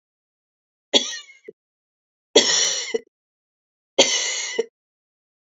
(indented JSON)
{
  "three_cough_length": "5.5 s",
  "three_cough_amplitude": 32725,
  "three_cough_signal_mean_std_ratio": 0.35,
  "survey_phase": "beta (2021-08-13 to 2022-03-07)",
  "age": "45-64",
  "gender": "Female",
  "wearing_mask": "No",
  "symptom_cough_any": true,
  "symptom_runny_or_blocked_nose": true,
  "symptom_loss_of_taste": true,
  "symptom_other": true,
  "symptom_onset": "3 days",
  "smoker_status": "Ex-smoker",
  "respiratory_condition_asthma": false,
  "respiratory_condition_other": false,
  "recruitment_source": "Test and Trace",
  "submission_delay": "1 day",
  "covid_test_result": "Positive",
  "covid_test_method": "RT-qPCR",
  "covid_ct_value": 18.5,
  "covid_ct_gene": "N gene"
}